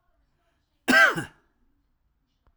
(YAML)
cough_length: 2.6 s
cough_amplitude: 15757
cough_signal_mean_std_ratio: 0.28
survey_phase: alpha (2021-03-01 to 2021-08-12)
age: 45-64
gender: Male
wearing_mask: 'No'
symptom_cough_any: true
symptom_fatigue: true
symptom_headache: true
symptom_onset: 3 days
smoker_status: Never smoked
respiratory_condition_asthma: false
respiratory_condition_other: false
recruitment_source: Test and Trace
submission_delay: 2 days
covid_test_result: Positive
covid_test_method: RT-qPCR
covid_ct_value: 23.3
covid_ct_gene: ORF1ab gene
covid_ct_mean: 24.3
covid_viral_load: 11000 copies/ml
covid_viral_load_category: Low viral load (10K-1M copies/ml)